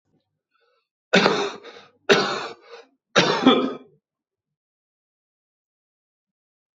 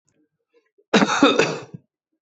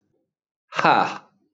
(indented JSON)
{
  "three_cough_length": "6.7 s",
  "three_cough_amplitude": 25108,
  "three_cough_signal_mean_std_ratio": 0.33,
  "cough_length": "2.2 s",
  "cough_amplitude": 25304,
  "cough_signal_mean_std_ratio": 0.4,
  "exhalation_length": "1.5 s",
  "exhalation_amplitude": 25314,
  "exhalation_signal_mean_std_ratio": 0.35,
  "survey_phase": "beta (2021-08-13 to 2022-03-07)",
  "age": "45-64",
  "gender": "Male",
  "wearing_mask": "No",
  "symptom_cough_any": true,
  "symptom_new_continuous_cough": true,
  "symptom_fatigue": true,
  "symptom_onset": "5 days",
  "smoker_status": "Never smoked",
  "respiratory_condition_asthma": false,
  "respiratory_condition_other": false,
  "recruitment_source": "Test and Trace",
  "submission_delay": "2 days",
  "covid_test_result": "Positive",
  "covid_test_method": "RT-qPCR",
  "covid_ct_value": 18.1,
  "covid_ct_gene": "N gene"
}